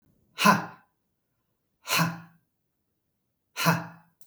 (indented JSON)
{
  "exhalation_length": "4.3 s",
  "exhalation_amplitude": 18472,
  "exhalation_signal_mean_std_ratio": 0.31,
  "survey_phase": "beta (2021-08-13 to 2022-03-07)",
  "age": "45-64",
  "gender": "Male",
  "wearing_mask": "No",
  "symptom_none": true,
  "smoker_status": "Never smoked",
  "respiratory_condition_asthma": false,
  "respiratory_condition_other": false,
  "recruitment_source": "REACT",
  "submission_delay": "2 days",
  "covid_test_result": "Negative",
  "covid_test_method": "RT-qPCR",
  "influenza_a_test_result": "Negative",
  "influenza_b_test_result": "Negative"
}